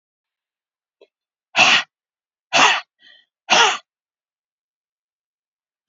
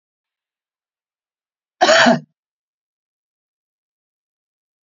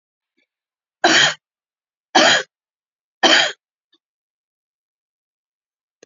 exhalation_length: 5.9 s
exhalation_amplitude: 31388
exhalation_signal_mean_std_ratio: 0.29
cough_length: 4.9 s
cough_amplitude: 32768
cough_signal_mean_std_ratio: 0.22
three_cough_length: 6.1 s
three_cough_amplitude: 30457
three_cough_signal_mean_std_ratio: 0.29
survey_phase: beta (2021-08-13 to 2022-03-07)
age: 45-64
gender: Female
wearing_mask: 'No'
symptom_cough_any: true
symptom_runny_or_blocked_nose: true
symptom_sore_throat: true
symptom_headache: true
symptom_onset: 5 days
smoker_status: Never smoked
respiratory_condition_asthma: false
respiratory_condition_other: false
recruitment_source: Test and Trace
submission_delay: 2 days
covid_test_result: Negative
covid_test_method: RT-qPCR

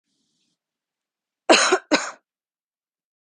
cough_length: 3.3 s
cough_amplitude: 30777
cough_signal_mean_std_ratio: 0.26
survey_phase: beta (2021-08-13 to 2022-03-07)
age: 18-44
gender: Female
wearing_mask: 'No'
symptom_none: true
smoker_status: Never smoked
respiratory_condition_asthma: false
respiratory_condition_other: false
recruitment_source: REACT
submission_delay: 9 days
covid_test_result: Negative
covid_test_method: RT-qPCR
influenza_a_test_result: Negative
influenza_b_test_result: Negative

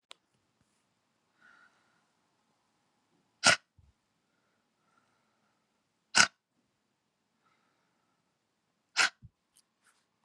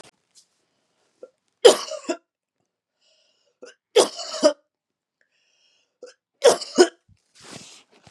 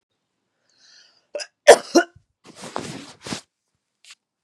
exhalation_length: 10.2 s
exhalation_amplitude: 16838
exhalation_signal_mean_std_ratio: 0.14
three_cough_length: 8.1 s
three_cough_amplitude: 32767
three_cough_signal_mean_std_ratio: 0.23
cough_length: 4.4 s
cough_amplitude: 32768
cough_signal_mean_std_ratio: 0.19
survey_phase: beta (2021-08-13 to 2022-03-07)
age: 45-64
gender: Female
wearing_mask: 'No'
symptom_cough_any: true
symptom_runny_or_blocked_nose: true
symptom_sore_throat: true
symptom_headache: true
symptom_other: true
symptom_onset: 3 days
smoker_status: Never smoked
respiratory_condition_asthma: false
respiratory_condition_other: false
recruitment_source: Test and Trace
submission_delay: 2 days
covid_test_result: Positive
covid_test_method: ePCR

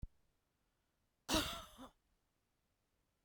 cough_length: 3.2 s
cough_amplitude: 2652
cough_signal_mean_std_ratio: 0.26
survey_phase: beta (2021-08-13 to 2022-03-07)
age: 45-64
gender: Female
wearing_mask: 'No'
symptom_new_continuous_cough: true
symptom_runny_or_blocked_nose: true
symptom_shortness_of_breath: true
symptom_sore_throat: true
symptom_fever_high_temperature: true
symptom_headache: true
smoker_status: Never smoked
respiratory_condition_asthma: false
respiratory_condition_other: false
recruitment_source: Test and Trace
submission_delay: 0 days
covid_test_result: Positive
covid_test_method: LFT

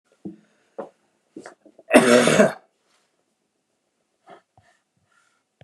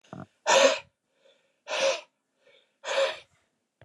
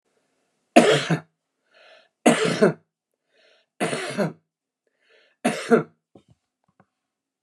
cough_length: 5.6 s
cough_amplitude: 29204
cough_signal_mean_std_ratio: 0.26
exhalation_length: 3.8 s
exhalation_amplitude: 14872
exhalation_signal_mean_std_ratio: 0.37
three_cough_length: 7.4 s
three_cough_amplitude: 29203
three_cough_signal_mean_std_ratio: 0.32
survey_phase: beta (2021-08-13 to 2022-03-07)
age: 45-64
gender: Male
wearing_mask: 'No'
symptom_runny_or_blocked_nose: true
smoker_status: Ex-smoker
respiratory_condition_asthma: true
respiratory_condition_other: false
recruitment_source: Test and Trace
submission_delay: 1 day
covid_test_result: Negative
covid_test_method: RT-qPCR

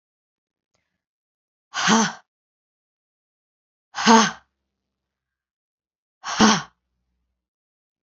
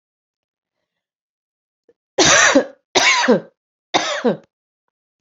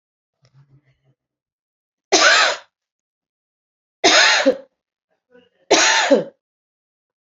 exhalation_length: 8.0 s
exhalation_amplitude: 28252
exhalation_signal_mean_std_ratio: 0.25
cough_length: 5.2 s
cough_amplitude: 32768
cough_signal_mean_std_ratio: 0.39
three_cough_length: 7.3 s
three_cough_amplitude: 31852
three_cough_signal_mean_std_ratio: 0.37
survey_phase: beta (2021-08-13 to 2022-03-07)
age: 45-64
gender: Female
wearing_mask: 'No'
symptom_cough_any: true
symptom_runny_or_blocked_nose: true
symptom_abdominal_pain: true
symptom_headache: true
symptom_change_to_sense_of_smell_or_taste: true
symptom_loss_of_taste: true
symptom_other: true
symptom_onset: 3 days
smoker_status: Never smoked
respiratory_condition_asthma: false
respiratory_condition_other: false
recruitment_source: Test and Trace
submission_delay: 2 days
covid_test_result: Positive
covid_test_method: RT-qPCR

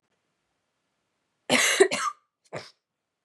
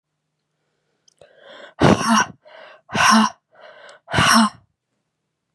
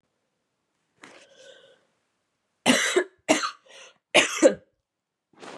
cough_length: 3.2 s
cough_amplitude: 18523
cough_signal_mean_std_ratio: 0.31
exhalation_length: 5.5 s
exhalation_amplitude: 32768
exhalation_signal_mean_std_ratio: 0.38
three_cough_length: 5.6 s
three_cough_amplitude: 24920
three_cough_signal_mean_std_ratio: 0.3
survey_phase: beta (2021-08-13 to 2022-03-07)
age: 18-44
gender: Female
wearing_mask: 'No'
symptom_cough_any: true
symptom_runny_or_blocked_nose: true
symptom_sore_throat: true
symptom_fatigue: true
symptom_headache: true
symptom_onset: 2 days
smoker_status: Never smoked
respiratory_condition_asthma: false
respiratory_condition_other: false
recruitment_source: Test and Trace
submission_delay: 1 day
covid_test_result: Positive
covid_test_method: RT-qPCR
covid_ct_value: 22.2
covid_ct_gene: ORF1ab gene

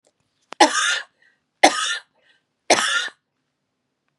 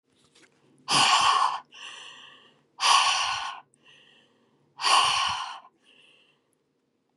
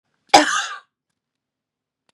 three_cough_length: 4.2 s
three_cough_amplitude: 32768
three_cough_signal_mean_std_ratio: 0.35
exhalation_length: 7.2 s
exhalation_amplitude: 16004
exhalation_signal_mean_std_ratio: 0.45
cough_length: 2.1 s
cough_amplitude: 32768
cough_signal_mean_std_ratio: 0.26
survey_phase: beta (2021-08-13 to 2022-03-07)
age: 45-64
gender: Female
wearing_mask: 'No'
symptom_runny_or_blocked_nose: true
symptom_headache: true
symptom_onset: 7 days
smoker_status: Never smoked
respiratory_condition_asthma: true
respiratory_condition_other: false
recruitment_source: REACT
submission_delay: 2 days
covid_test_result: Negative
covid_test_method: RT-qPCR
influenza_a_test_result: Negative
influenza_b_test_result: Negative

